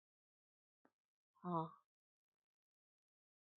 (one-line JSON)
{"exhalation_length": "3.6 s", "exhalation_amplitude": 1300, "exhalation_signal_mean_std_ratio": 0.19, "survey_phase": "beta (2021-08-13 to 2022-03-07)", "age": "45-64", "gender": "Female", "wearing_mask": "No", "symptom_none": true, "smoker_status": "Never smoked", "respiratory_condition_asthma": false, "respiratory_condition_other": false, "recruitment_source": "REACT", "submission_delay": "1 day", "covid_test_result": "Negative", "covid_test_method": "RT-qPCR", "influenza_a_test_result": "Negative", "influenza_b_test_result": "Negative"}